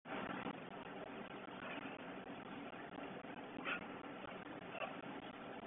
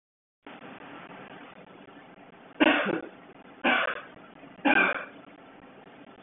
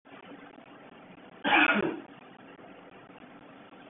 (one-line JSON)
{"exhalation_length": "5.7 s", "exhalation_amplitude": 938, "exhalation_signal_mean_std_ratio": 1.02, "three_cough_length": "6.2 s", "three_cough_amplitude": 12873, "three_cough_signal_mean_std_ratio": 0.4, "cough_length": "3.9 s", "cough_amplitude": 9036, "cough_signal_mean_std_ratio": 0.37, "survey_phase": "beta (2021-08-13 to 2022-03-07)", "age": "18-44", "gender": "Male", "wearing_mask": "No", "symptom_cough_any": true, "symptom_sore_throat": true, "symptom_fatigue": true, "symptom_headache": true, "smoker_status": "Never smoked", "respiratory_condition_asthma": false, "respiratory_condition_other": false, "recruitment_source": "Test and Trace", "submission_delay": "2 days", "covid_test_result": "Positive", "covid_test_method": "RT-qPCR", "covid_ct_value": 24.7, "covid_ct_gene": "ORF1ab gene", "covid_ct_mean": 25.3, "covid_viral_load": "5000 copies/ml", "covid_viral_load_category": "Minimal viral load (< 10K copies/ml)"}